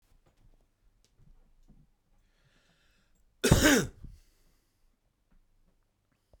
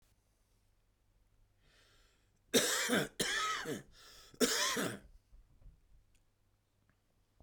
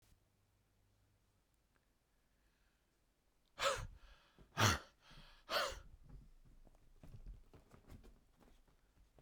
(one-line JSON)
{"cough_length": "6.4 s", "cough_amplitude": 14237, "cough_signal_mean_std_ratio": 0.21, "three_cough_length": "7.4 s", "three_cough_amplitude": 5207, "three_cough_signal_mean_std_ratio": 0.39, "exhalation_length": "9.2 s", "exhalation_amplitude": 4284, "exhalation_signal_mean_std_ratio": 0.28, "survey_phase": "beta (2021-08-13 to 2022-03-07)", "age": "45-64", "gender": "Male", "wearing_mask": "No", "symptom_cough_any": true, "symptom_runny_or_blocked_nose": true, "symptom_shortness_of_breath": true, "symptom_sore_throat": true, "symptom_fatigue": true, "symptom_headache": true, "symptom_onset": "7 days", "smoker_status": "Ex-smoker", "respiratory_condition_asthma": false, "respiratory_condition_other": false, "recruitment_source": "Test and Trace", "submission_delay": "2 days", "covid_test_result": "Positive", "covid_test_method": "RT-qPCR", "covid_ct_value": 19.5, "covid_ct_gene": "ORF1ab gene"}